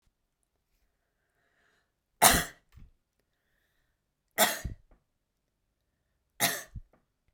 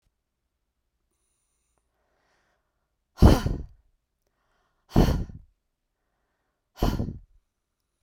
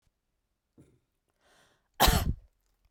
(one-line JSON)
{"three_cough_length": "7.3 s", "three_cough_amplitude": 24125, "three_cough_signal_mean_std_ratio": 0.21, "exhalation_length": "8.0 s", "exhalation_amplitude": 23821, "exhalation_signal_mean_std_ratio": 0.23, "cough_length": "2.9 s", "cough_amplitude": 13077, "cough_signal_mean_std_ratio": 0.26, "survey_phase": "beta (2021-08-13 to 2022-03-07)", "age": "18-44", "gender": "Female", "wearing_mask": "No", "symptom_fatigue": true, "symptom_headache": true, "symptom_onset": "12 days", "smoker_status": "Never smoked", "respiratory_condition_asthma": false, "respiratory_condition_other": false, "recruitment_source": "REACT", "submission_delay": "10 days", "covid_test_result": "Negative", "covid_test_method": "RT-qPCR"}